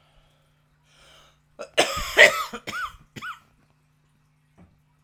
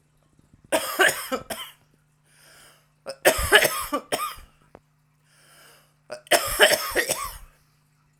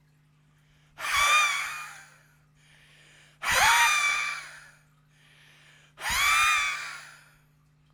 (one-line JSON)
{"cough_length": "5.0 s", "cough_amplitude": 32768, "cough_signal_mean_std_ratio": 0.26, "three_cough_length": "8.2 s", "three_cough_amplitude": 32767, "three_cough_signal_mean_std_ratio": 0.38, "exhalation_length": "7.9 s", "exhalation_amplitude": 12452, "exhalation_signal_mean_std_ratio": 0.49, "survey_phase": "alpha (2021-03-01 to 2021-08-12)", "age": "18-44", "gender": "Female", "wearing_mask": "No", "symptom_cough_any": true, "symptom_fatigue": true, "symptom_headache": true, "smoker_status": "Ex-smoker", "respiratory_condition_asthma": false, "respiratory_condition_other": false, "recruitment_source": "Test and Trace", "submission_delay": "1 day", "covid_test_result": "Positive", "covid_test_method": "RT-qPCR", "covid_ct_value": 16.6, "covid_ct_gene": "ORF1ab gene", "covid_ct_mean": 17.0, "covid_viral_load": "2700000 copies/ml", "covid_viral_load_category": "High viral load (>1M copies/ml)"}